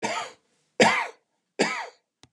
{"cough_length": "2.3 s", "cough_amplitude": 22170, "cough_signal_mean_std_ratio": 0.41, "survey_phase": "beta (2021-08-13 to 2022-03-07)", "age": "65+", "gender": "Male", "wearing_mask": "No", "symptom_none": true, "smoker_status": "Ex-smoker", "respiratory_condition_asthma": false, "respiratory_condition_other": false, "recruitment_source": "REACT", "submission_delay": "1 day", "covid_test_result": "Negative", "covid_test_method": "RT-qPCR", "influenza_a_test_result": "Negative", "influenza_b_test_result": "Negative"}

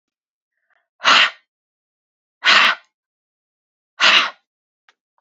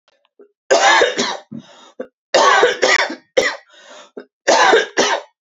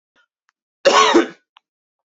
{"exhalation_length": "5.2 s", "exhalation_amplitude": 32768, "exhalation_signal_mean_std_ratio": 0.32, "three_cough_length": "5.5 s", "three_cough_amplitude": 32652, "three_cough_signal_mean_std_ratio": 0.54, "cough_length": "2.0 s", "cough_amplitude": 30932, "cough_signal_mean_std_ratio": 0.36, "survey_phase": "beta (2021-08-13 to 2022-03-07)", "age": "18-44", "gender": "Female", "wearing_mask": "No", "symptom_none": true, "smoker_status": "Never smoked", "respiratory_condition_asthma": false, "respiratory_condition_other": false, "recruitment_source": "REACT", "submission_delay": "1 day", "covid_test_result": "Negative", "covid_test_method": "RT-qPCR"}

